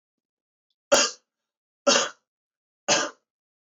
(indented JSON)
{
  "three_cough_length": "3.7 s",
  "three_cough_amplitude": 16129,
  "three_cough_signal_mean_std_ratio": 0.31,
  "survey_phase": "beta (2021-08-13 to 2022-03-07)",
  "age": "18-44",
  "gender": "Male",
  "wearing_mask": "No",
  "symptom_cough_any": true,
  "symptom_headache": true,
  "smoker_status": "Never smoked",
  "respiratory_condition_asthma": false,
  "respiratory_condition_other": false,
  "recruitment_source": "Test and Trace",
  "submission_delay": "1 day",
  "covid_test_result": "Positive",
  "covid_test_method": "RT-qPCR",
  "covid_ct_value": 20.3,
  "covid_ct_gene": "ORF1ab gene",
  "covid_ct_mean": 20.8,
  "covid_viral_load": "150000 copies/ml",
  "covid_viral_load_category": "Low viral load (10K-1M copies/ml)"
}